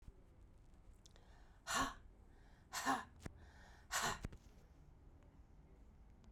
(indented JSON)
{
  "exhalation_length": "6.3 s",
  "exhalation_amplitude": 1808,
  "exhalation_signal_mean_std_ratio": 0.45,
  "survey_phase": "beta (2021-08-13 to 2022-03-07)",
  "age": "45-64",
  "gender": "Female",
  "wearing_mask": "No",
  "symptom_cough_any": true,
  "symptom_onset": "10 days",
  "smoker_status": "Never smoked",
  "respiratory_condition_asthma": false,
  "respiratory_condition_other": false,
  "recruitment_source": "REACT",
  "submission_delay": "1 day",
  "covid_test_result": "Negative",
  "covid_test_method": "RT-qPCR",
  "influenza_a_test_result": "Unknown/Void",
  "influenza_b_test_result": "Unknown/Void"
}